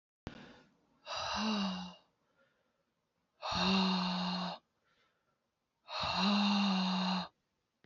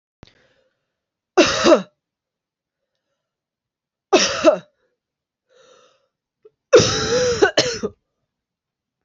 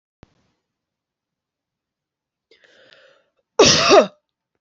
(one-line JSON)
{"exhalation_length": "7.9 s", "exhalation_amplitude": 3239, "exhalation_signal_mean_std_ratio": 0.59, "three_cough_length": "9.0 s", "three_cough_amplitude": 28646, "three_cough_signal_mean_std_ratio": 0.33, "cough_length": "4.6 s", "cough_amplitude": 32768, "cough_signal_mean_std_ratio": 0.25, "survey_phase": "beta (2021-08-13 to 2022-03-07)", "age": "18-44", "gender": "Female", "wearing_mask": "No", "symptom_cough_any": true, "symptom_runny_or_blocked_nose": true, "symptom_headache": true, "symptom_change_to_sense_of_smell_or_taste": true, "symptom_onset": "3 days", "smoker_status": "Never smoked", "respiratory_condition_asthma": false, "respiratory_condition_other": false, "recruitment_source": "Test and Trace", "submission_delay": "2 days", "covid_test_method": "RT-qPCR", "covid_ct_value": 21.1, "covid_ct_gene": "N gene"}